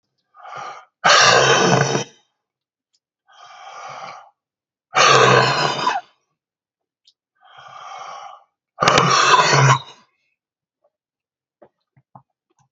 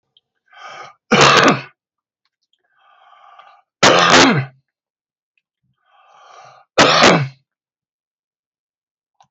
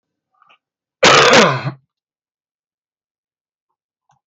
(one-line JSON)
{"exhalation_length": "12.7 s", "exhalation_amplitude": 32768, "exhalation_signal_mean_std_ratio": 0.42, "three_cough_length": "9.3 s", "three_cough_amplitude": 32768, "three_cough_signal_mean_std_ratio": 0.35, "cough_length": "4.3 s", "cough_amplitude": 32768, "cough_signal_mean_std_ratio": 0.31, "survey_phase": "beta (2021-08-13 to 2022-03-07)", "age": "65+", "gender": "Male", "wearing_mask": "No", "symptom_cough_any": true, "smoker_status": "Ex-smoker", "respiratory_condition_asthma": true, "respiratory_condition_other": true, "recruitment_source": "REACT", "submission_delay": "1 day", "covid_test_result": "Negative", "covid_test_method": "RT-qPCR"}